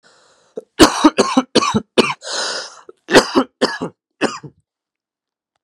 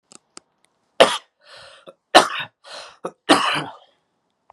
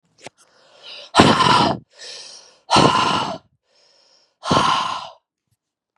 {
  "cough_length": "5.6 s",
  "cough_amplitude": 32768,
  "cough_signal_mean_std_ratio": 0.39,
  "three_cough_length": "4.5 s",
  "three_cough_amplitude": 32768,
  "three_cough_signal_mean_std_ratio": 0.28,
  "exhalation_length": "6.0 s",
  "exhalation_amplitude": 32768,
  "exhalation_signal_mean_std_ratio": 0.45,
  "survey_phase": "beta (2021-08-13 to 2022-03-07)",
  "age": "18-44",
  "gender": "Male",
  "wearing_mask": "No",
  "symptom_cough_any": true,
  "symptom_shortness_of_breath": true,
  "symptom_sore_throat": true,
  "symptom_onset": "2 days",
  "smoker_status": "Never smoked",
  "respiratory_condition_asthma": false,
  "respiratory_condition_other": false,
  "recruitment_source": "Test and Trace",
  "submission_delay": "2 days",
  "covid_test_result": "Positive",
  "covid_test_method": "RT-qPCR",
  "covid_ct_value": 15.8,
  "covid_ct_gene": "N gene",
  "covid_ct_mean": 15.8,
  "covid_viral_load": "6600000 copies/ml",
  "covid_viral_load_category": "High viral load (>1M copies/ml)"
}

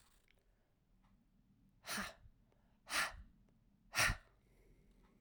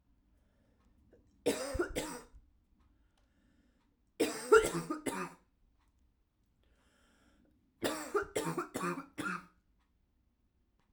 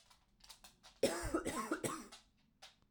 {
  "exhalation_length": "5.2 s",
  "exhalation_amplitude": 2848,
  "exhalation_signal_mean_std_ratio": 0.31,
  "three_cough_length": "10.9 s",
  "three_cough_amplitude": 8731,
  "three_cough_signal_mean_std_ratio": 0.33,
  "cough_length": "2.9 s",
  "cough_amplitude": 2919,
  "cough_signal_mean_std_ratio": 0.46,
  "survey_phase": "alpha (2021-03-01 to 2021-08-12)",
  "age": "18-44",
  "gender": "Female",
  "wearing_mask": "No",
  "symptom_cough_any": true,
  "symptom_fatigue": true,
  "smoker_status": "Ex-smoker",
  "respiratory_condition_asthma": false,
  "respiratory_condition_other": false,
  "recruitment_source": "Test and Trace",
  "submission_delay": "2 days",
  "covid_test_result": "Positive",
  "covid_test_method": "RT-qPCR",
  "covid_ct_value": 32.0,
  "covid_ct_gene": "ORF1ab gene"
}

